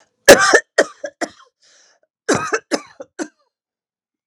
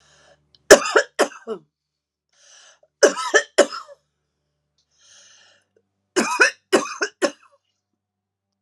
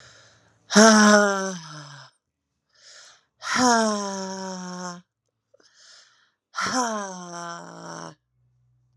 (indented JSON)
{
  "cough_length": "4.3 s",
  "cough_amplitude": 32768,
  "cough_signal_mean_std_ratio": 0.29,
  "three_cough_length": "8.6 s",
  "three_cough_amplitude": 32768,
  "three_cough_signal_mean_std_ratio": 0.27,
  "exhalation_length": "9.0 s",
  "exhalation_amplitude": 32103,
  "exhalation_signal_mean_std_ratio": 0.38,
  "survey_phase": "alpha (2021-03-01 to 2021-08-12)",
  "age": "45-64",
  "gender": "Female",
  "wearing_mask": "No",
  "symptom_shortness_of_breath": true,
  "symptom_fatigue": true,
  "symptom_change_to_sense_of_smell_or_taste": true,
  "symptom_onset": "3 days",
  "smoker_status": "Never smoked",
  "respiratory_condition_asthma": false,
  "respiratory_condition_other": false,
  "recruitment_source": "Test and Trace",
  "submission_delay": "2 days",
  "covid_test_result": "Positive",
  "covid_test_method": "RT-qPCR"
}